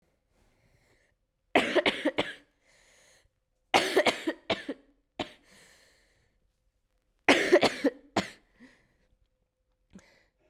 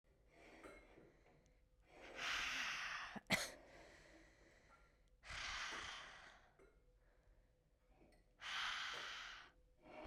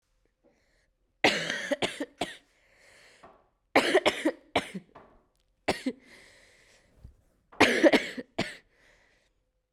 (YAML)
three_cough_length: 10.5 s
three_cough_amplitude: 18369
three_cough_signal_mean_std_ratio: 0.3
exhalation_length: 10.1 s
exhalation_amplitude: 1847
exhalation_signal_mean_std_ratio: 0.54
cough_length: 9.7 s
cough_amplitude: 20417
cough_signal_mean_std_ratio: 0.32
survey_phase: beta (2021-08-13 to 2022-03-07)
age: 18-44
gender: Female
wearing_mask: 'No'
symptom_cough_any: true
symptom_new_continuous_cough: true
symptom_runny_or_blocked_nose: true
symptom_shortness_of_breath: true
symptom_sore_throat: true
symptom_abdominal_pain: true
symptom_fatigue: true
symptom_headache: true
symptom_change_to_sense_of_smell_or_taste: true
smoker_status: Never smoked
respiratory_condition_asthma: true
respiratory_condition_other: false
recruitment_source: Test and Trace
submission_delay: 2 days
covid_test_result: Positive
covid_test_method: RT-qPCR
covid_ct_value: 27.6
covid_ct_gene: ORF1ab gene
covid_ct_mean: 28.2
covid_viral_load: 550 copies/ml
covid_viral_load_category: Minimal viral load (< 10K copies/ml)